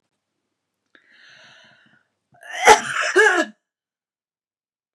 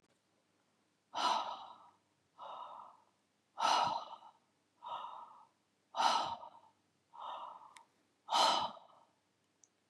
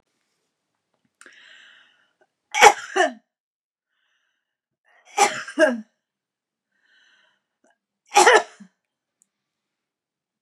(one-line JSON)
{"cough_length": "4.9 s", "cough_amplitude": 32768, "cough_signal_mean_std_ratio": 0.28, "exhalation_length": "9.9 s", "exhalation_amplitude": 4668, "exhalation_signal_mean_std_ratio": 0.39, "three_cough_length": "10.4 s", "three_cough_amplitude": 32768, "three_cough_signal_mean_std_ratio": 0.23, "survey_phase": "beta (2021-08-13 to 2022-03-07)", "age": "45-64", "gender": "Female", "wearing_mask": "No", "symptom_none": true, "smoker_status": "Never smoked", "respiratory_condition_asthma": false, "respiratory_condition_other": false, "recruitment_source": "REACT", "submission_delay": "2 days", "covid_test_result": "Negative", "covid_test_method": "RT-qPCR", "influenza_a_test_result": "Negative", "influenza_b_test_result": "Negative"}